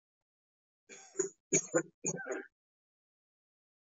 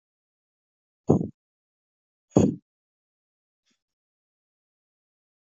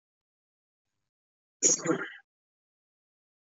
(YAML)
three_cough_length: 3.9 s
three_cough_amplitude: 5979
three_cough_signal_mean_std_ratio: 0.29
exhalation_length: 5.5 s
exhalation_amplitude: 21853
exhalation_signal_mean_std_ratio: 0.17
cough_length: 3.6 s
cough_amplitude: 11398
cough_signal_mean_std_ratio: 0.24
survey_phase: beta (2021-08-13 to 2022-03-07)
age: 18-44
gender: Male
wearing_mask: 'No'
symptom_none: true
smoker_status: Ex-smoker
respiratory_condition_asthma: false
respiratory_condition_other: false
recruitment_source: Test and Trace
submission_delay: 2 days
covid_test_result: Positive
covid_test_method: RT-qPCR
covid_ct_value: 32.6
covid_ct_gene: ORF1ab gene